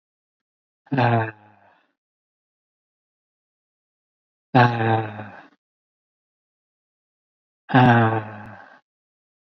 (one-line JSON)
{"exhalation_length": "9.6 s", "exhalation_amplitude": 26828, "exhalation_signal_mean_std_ratio": 0.3, "survey_phase": "beta (2021-08-13 to 2022-03-07)", "age": "18-44", "gender": "Male", "wearing_mask": "No", "symptom_fatigue": true, "symptom_headache": true, "symptom_onset": "12 days", "smoker_status": "Never smoked", "respiratory_condition_asthma": true, "respiratory_condition_other": false, "recruitment_source": "REACT", "submission_delay": "2 days", "covid_test_result": "Negative", "covid_test_method": "RT-qPCR", "influenza_a_test_result": "Negative", "influenza_b_test_result": "Negative"}